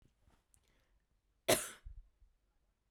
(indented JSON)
{
  "cough_length": "2.9 s",
  "cough_amplitude": 6689,
  "cough_signal_mean_std_ratio": 0.21,
  "survey_phase": "beta (2021-08-13 to 2022-03-07)",
  "age": "18-44",
  "gender": "Female",
  "wearing_mask": "No",
  "symptom_none": true,
  "smoker_status": "Never smoked",
  "respiratory_condition_asthma": false,
  "respiratory_condition_other": false,
  "recruitment_source": "REACT",
  "submission_delay": "4 days",
  "covid_test_result": "Negative",
  "covid_test_method": "RT-qPCR"
}